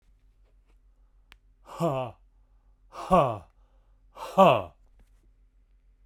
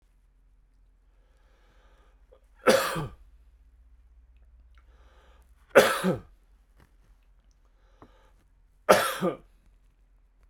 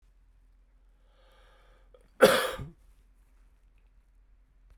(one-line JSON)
{"exhalation_length": "6.1 s", "exhalation_amplitude": 17749, "exhalation_signal_mean_std_ratio": 0.3, "three_cough_length": "10.5 s", "three_cough_amplitude": 28361, "three_cough_signal_mean_std_ratio": 0.25, "cough_length": "4.8 s", "cough_amplitude": 17148, "cough_signal_mean_std_ratio": 0.21, "survey_phase": "beta (2021-08-13 to 2022-03-07)", "age": "45-64", "gender": "Male", "wearing_mask": "No", "symptom_cough_any": true, "symptom_sore_throat": true, "symptom_onset": "3 days", "smoker_status": "Never smoked", "respiratory_condition_asthma": false, "respiratory_condition_other": false, "recruitment_source": "Test and Trace", "submission_delay": "2 days", "covid_test_result": "Positive", "covid_test_method": "ePCR"}